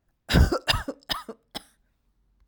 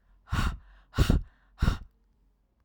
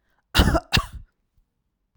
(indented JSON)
{
  "three_cough_length": "2.5 s",
  "three_cough_amplitude": 18204,
  "three_cough_signal_mean_std_ratio": 0.35,
  "exhalation_length": "2.6 s",
  "exhalation_amplitude": 10754,
  "exhalation_signal_mean_std_ratio": 0.39,
  "cough_length": "2.0 s",
  "cough_amplitude": 24923,
  "cough_signal_mean_std_ratio": 0.33,
  "survey_phase": "alpha (2021-03-01 to 2021-08-12)",
  "age": "45-64",
  "gender": "Female",
  "wearing_mask": "No",
  "symptom_none": true,
  "smoker_status": "Ex-smoker",
  "respiratory_condition_asthma": true,
  "respiratory_condition_other": false,
  "recruitment_source": "REACT",
  "submission_delay": "0 days",
  "covid_test_result": "Negative",
  "covid_test_method": "RT-qPCR"
}